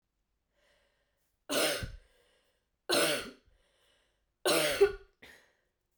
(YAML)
three_cough_length: 6.0 s
three_cough_amplitude: 6615
three_cough_signal_mean_std_ratio: 0.35
survey_phase: beta (2021-08-13 to 2022-03-07)
age: 18-44
gender: Female
wearing_mask: 'No'
symptom_cough_any: true
symptom_new_continuous_cough: true
symptom_runny_or_blocked_nose: true
symptom_fatigue: true
symptom_headache: true
symptom_change_to_sense_of_smell_or_taste: true
symptom_other: true
symptom_onset: 4 days
smoker_status: Never smoked
respiratory_condition_asthma: false
respiratory_condition_other: false
recruitment_source: Test and Trace
submission_delay: 2 days
covid_test_result: Positive
covid_test_method: RT-qPCR
covid_ct_value: 20.0
covid_ct_gene: ORF1ab gene